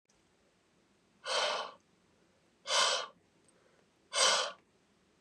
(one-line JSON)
{"exhalation_length": "5.2 s", "exhalation_amplitude": 8265, "exhalation_signal_mean_std_ratio": 0.38, "survey_phase": "beta (2021-08-13 to 2022-03-07)", "age": "45-64", "gender": "Male", "wearing_mask": "No", "symptom_none": true, "smoker_status": "Never smoked", "respiratory_condition_asthma": false, "respiratory_condition_other": false, "recruitment_source": "REACT", "submission_delay": "1 day", "covid_test_result": "Negative", "covid_test_method": "RT-qPCR", "influenza_a_test_result": "Negative", "influenza_b_test_result": "Negative"}